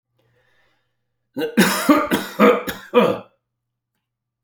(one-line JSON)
{"three_cough_length": "4.4 s", "three_cough_amplitude": 28155, "three_cough_signal_mean_std_ratio": 0.41, "survey_phase": "alpha (2021-03-01 to 2021-08-12)", "age": "45-64", "gender": "Male", "wearing_mask": "No", "symptom_none": true, "smoker_status": "Never smoked", "respiratory_condition_asthma": false, "respiratory_condition_other": false, "recruitment_source": "REACT", "submission_delay": "1 day", "covid_test_result": "Negative", "covid_test_method": "RT-qPCR"}